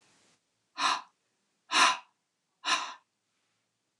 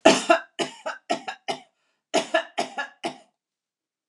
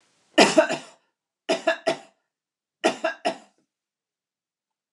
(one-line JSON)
{"exhalation_length": "4.0 s", "exhalation_amplitude": 13371, "exhalation_signal_mean_std_ratio": 0.31, "cough_length": "4.1 s", "cough_amplitude": 29203, "cough_signal_mean_std_ratio": 0.35, "three_cough_length": "4.9 s", "three_cough_amplitude": 27720, "three_cough_signal_mean_std_ratio": 0.31, "survey_phase": "beta (2021-08-13 to 2022-03-07)", "age": "45-64", "gender": "Female", "wearing_mask": "No", "symptom_none": true, "smoker_status": "Never smoked", "respiratory_condition_asthma": false, "respiratory_condition_other": false, "recruitment_source": "REACT", "submission_delay": "1 day", "covid_test_result": "Negative", "covid_test_method": "RT-qPCR"}